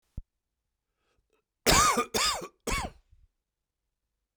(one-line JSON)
{"cough_length": "4.4 s", "cough_amplitude": 13997, "cough_signal_mean_std_ratio": 0.35, "survey_phase": "beta (2021-08-13 to 2022-03-07)", "age": "45-64", "gender": "Male", "wearing_mask": "No", "symptom_cough_any": true, "symptom_new_continuous_cough": true, "symptom_sore_throat": true, "symptom_fatigue": true, "symptom_fever_high_temperature": true, "symptom_headache": true, "symptom_onset": "3 days", "smoker_status": "Never smoked", "respiratory_condition_asthma": false, "respiratory_condition_other": false, "recruitment_source": "Test and Trace", "submission_delay": "2 days", "covid_test_result": "Positive", "covid_test_method": "RT-qPCR", "covid_ct_value": 14.5, "covid_ct_gene": "S gene", "covid_ct_mean": 14.6, "covid_viral_load": "16000000 copies/ml", "covid_viral_load_category": "High viral load (>1M copies/ml)"}